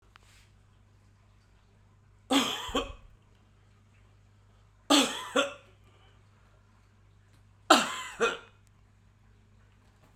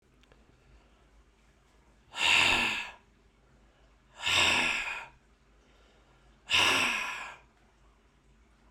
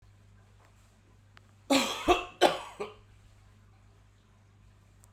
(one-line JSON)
{"three_cough_length": "10.2 s", "three_cough_amplitude": 21810, "three_cough_signal_mean_std_ratio": 0.29, "exhalation_length": "8.7 s", "exhalation_amplitude": 9153, "exhalation_signal_mean_std_ratio": 0.42, "cough_length": "5.1 s", "cough_amplitude": 13330, "cough_signal_mean_std_ratio": 0.3, "survey_phase": "alpha (2021-03-01 to 2021-08-12)", "age": "45-64", "gender": "Male", "wearing_mask": "No", "symptom_fatigue": true, "symptom_fever_high_temperature": true, "symptom_headache": true, "symptom_change_to_sense_of_smell_or_taste": true, "smoker_status": "Ex-smoker", "respiratory_condition_asthma": false, "respiratory_condition_other": false, "recruitment_source": "Test and Trace", "submission_delay": "2 days", "covid_test_result": "Positive", "covid_test_method": "RT-qPCR", "covid_ct_value": 24.6, "covid_ct_gene": "ORF1ab gene"}